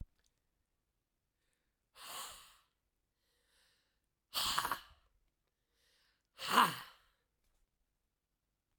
{"exhalation_length": "8.8 s", "exhalation_amplitude": 7865, "exhalation_signal_mean_std_ratio": 0.23, "survey_phase": "beta (2021-08-13 to 2022-03-07)", "age": "45-64", "gender": "Male", "wearing_mask": "No", "symptom_new_continuous_cough": true, "symptom_change_to_sense_of_smell_or_taste": true, "symptom_onset": "5 days", "smoker_status": "Never smoked", "respiratory_condition_asthma": true, "respiratory_condition_other": false, "recruitment_source": "Test and Trace", "submission_delay": "2 days", "covid_test_result": "Positive", "covid_test_method": "RT-qPCR", "covid_ct_value": 21.7, "covid_ct_gene": "ORF1ab gene", "covid_ct_mean": 22.5, "covid_viral_load": "43000 copies/ml", "covid_viral_load_category": "Low viral load (10K-1M copies/ml)"}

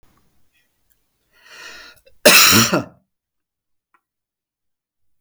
{"cough_length": "5.2 s", "cough_amplitude": 32768, "cough_signal_mean_std_ratio": 0.27, "survey_phase": "beta (2021-08-13 to 2022-03-07)", "age": "45-64", "gender": "Male", "wearing_mask": "No", "symptom_none": true, "smoker_status": "Ex-smoker", "respiratory_condition_asthma": false, "respiratory_condition_other": false, "recruitment_source": "REACT", "submission_delay": "2 days", "covid_test_result": "Negative", "covid_test_method": "RT-qPCR"}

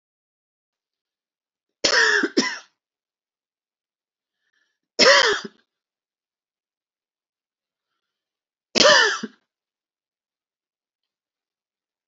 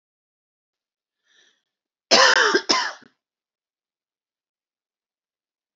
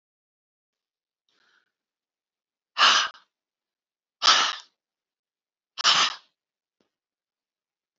{"three_cough_length": "12.1 s", "three_cough_amplitude": 29411, "three_cough_signal_mean_std_ratio": 0.26, "cough_length": "5.8 s", "cough_amplitude": 29440, "cough_signal_mean_std_ratio": 0.26, "exhalation_length": "8.0 s", "exhalation_amplitude": 19758, "exhalation_signal_mean_std_ratio": 0.26, "survey_phase": "beta (2021-08-13 to 2022-03-07)", "age": "65+", "gender": "Female", "wearing_mask": "No", "symptom_runny_or_blocked_nose": true, "symptom_abdominal_pain": true, "symptom_fatigue": true, "symptom_onset": "12 days", "smoker_status": "Ex-smoker", "respiratory_condition_asthma": false, "respiratory_condition_other": false, "recruitment_source": "REACT", "submission_delay": "2 days", "covid_test_result": "Negative", "covid_test_method": "RT-qPCR", "influenza_a_test_result": "Negative", "influenza_b_test_result": "Negative"}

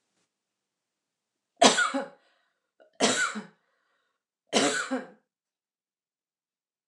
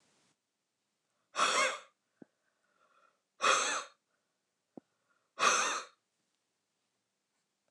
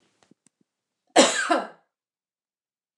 {"three_cough_length": "6.9 s", "three_cough_amplitude": 24144, "three_cough_signal_mean_std_ratio": 0.3, "exhalation_length": "7.7 s", "exhalation_amplitude": 6819, "exhalation_signal_mean_std_ratio": 0.32, "cough_length": "3.0 s", "cough_amplitude": 27390, "cough_signal_mean_std_ratio": 0.27, "survey_phase": "beta (2021-08-13 to 2022-03-07)", "age": "45-64", "gender": "Female", "wearing_mask": "No", "symptom_none": true, "smoker_status": "Never smoked", "respiratory_condition_asthma": false, "respiratory_condition_other": false, "recruitment_source": "REACT", "submission_delay": "1 day", "covid_test_result": "Negative", "covid_test_method": "RT-qPCR"}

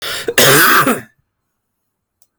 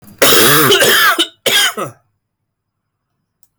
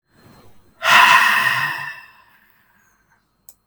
{"cough_length": "2.4 s", "cough_amplitude": 32768, "cough_signal_mean_std_ratio": 0.5, "three_cough_length": "3.6 s", "three_cough_amplitude": 32768, "three_cough_signal_mean_std_ratio": 0.59, "exhalation_length": "3.7 s", "exhalation_amplitude": 32768, "exhalation_signal_mean_std_ratio": 0.42, "survey_phase": "beta (2021-08-13 to 2022-03-07)", "age": "18-44", "gender": "Male", "wearing_mask": "No", "symptom_cough_any": true, "symptom_fatigue": true, "symptom_fever_high_temperature": true, "symptom_headache": true, "symptom_change_to_sense_of_smell_or_taste": true, "symptom_loss_of_taste": true, "symptom_onset": "3 days", "smoker_status": "Never smoked", "respiratory_condition_asthma": false, "respiratory_condition_other": false, "recruitment_source": "Test and Trace", "submission_delay": "3 days", "covid_test_result": "Positive", "covid_test_method": "RT-qPCR"}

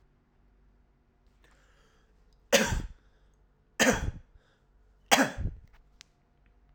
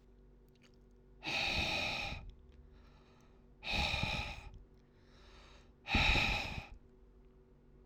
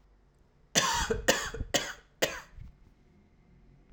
{"three_cough_length": "6.7 s", "three_cough_amplitude": 18608, "three_cough_signal_mean_std_ratio": 0.29, "exhalation_length": "7.9 s", "exhalation_amplitude": 4096, "exhalation_signal_mean_std_ratio": 0.51, "cough_length": "3.9 s", "cough_amplitude": 13263, "cough_signal_mean_std_ratio": 0.42, "survey_phase": "alpha (2021-03-01 to 2021-08-12)", "age": "18-44", "gender": "Male", "wearing_mask": "No", "symptom_none": true, "smoker_status": "Current smoker (e-cigarettes or vapes only)", "respiratory_condition_asthma": false, "respiratory_condition_other": false, "recruitment_source": "REACT", "submission_delay": "1 day", "covid_test_result": "Negative", "covid_test_method": "RT-qPCR"}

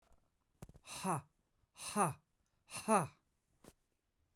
{"exhalation_length": "4.4 s", "exhalation_amplitude": 3709, "exhalation_signal_mean_std_ratio": 0.33, "survey_phase": "beta (2021-08-13 to 2022-03-07)", "age": "18-44", "gender": "Male", "wearing_mask": "No", "symptom_none": true, "smoker_status": "Ex-smoker", "respiratory_condition_asthma": true, "respiratory_condition_other": false, "recruitment_source": "REACT", "submission_delay": "4 days", "covid_test_result": "Negative", "covid_test_method": "RT-qPCR", "influenza_a_test_result": "Negative", "influenza_b_test_result": "Negative"}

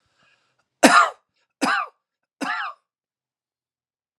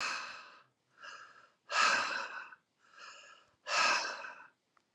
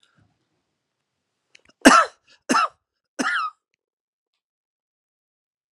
{"three_cough_length": "4.2 s", "three_cough_amplitude": 32767, "three_cough_signal_mean_std_ratio": 0.28, "exhalation_length": "4.9 s", "exhalation_amplitude": 4839, "exhalation_signal_mean_std_ratio": 0.47, "cough_length": "5.7 s", "cough_amplitude": 32768, "cough_signal_mean_std_ratio": 0.23, "survey_phase": "alpha (2021-03-01 to 2021-08-12)", "age": "45-64", "gender": "Male", "wearing_mask": "No", "symptom_none": true, "smoker_status": "Never smoked", "respiratory_condition_asthma": false, "respiratory_condition_other": false, "recruitment_source": "REACT", "submission_delay": "1 day", "covid_test_result": "Negative", "covid_test_method": "RT-qPCR"}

